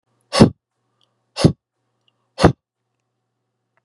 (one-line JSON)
{"exhalation_length": "3.8 s", "exhalation_amplitude": 32768, "exhalation_signal_mean_std_ratio": 0.22, "survey_phase": "beta (2021-08-13 to 2022-03-07)", "age": "45-64", "gender": "Male", "wearing_mask": "No", "symptom_none": true, "smoker_status": "Never smoked", "respiratory_condition_asthma": false, "respiratory_condition_other": false, "recruitment_source": "REACT", "submission_delay": "2 days", "covid_test_result": "Negative", "covid_test_method": "RT-qPCR", "influenza_a_test_result": "Negative", "influenza_b_test_result": "Negative"}